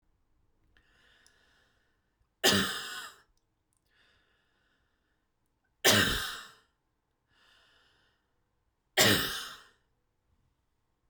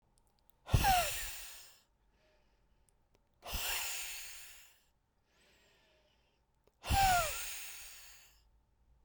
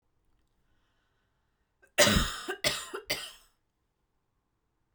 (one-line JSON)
{"three_cough_length": "11.1 s", "three_cough_amplitude": 11008, "three_cough_signal_mean_std_ratio": 0.27, "exhalation_length": "9.0 s", "exhalation_amplitude": 5032, "exhalation_signal_mean_std_ratio": 0.39, "cough_length": "4.9 s", "cough_amplitude": 14643, "cough_signal_mean_std_ratio": 0.29, "survey_phase": "beta (2021-08-13 to 2022-03-07)", "age": "18-44", "gender": "Female", "wearing_mask": "No", "symptom_none": true, "smoker_status": "Never smoked", "respiratory_condition_asthma": false, "respiratory_condition_other": false, "recruitment_source": "REACT", "submission_delay": "0 days", "covid_test_result": "Negative", "covid_test_method": "RT-qPCR"}